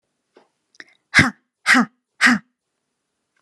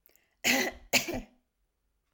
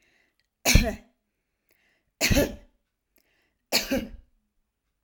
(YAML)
exhalation_length: 3.4 s
exhalation_amplitude: 32658
exhalation_signal_mean_std_ratio: 0.3
cough_length: 2.1 s
cough_amplitude: 10960
cough_signal_mean_std_ratio: 0.38
three_cough_length: 5.0 s
three_cough_amplitude: 25171
three_cough_signal_mean_std_ratio: 0.3
survey_phase: alpha (2021-03-01 to 2021-08-12)
age: 45-64
gender: Female
wearing_mask: 'No'
symptom_none: true
smoker_status: Never smoked
respiratory_condition_asthma: false
respiratory_condition_other: false
recruitment_source: REACT
submission_delay: 2 days
covid_test_result: Negative
covid_test_method: RT-qPCR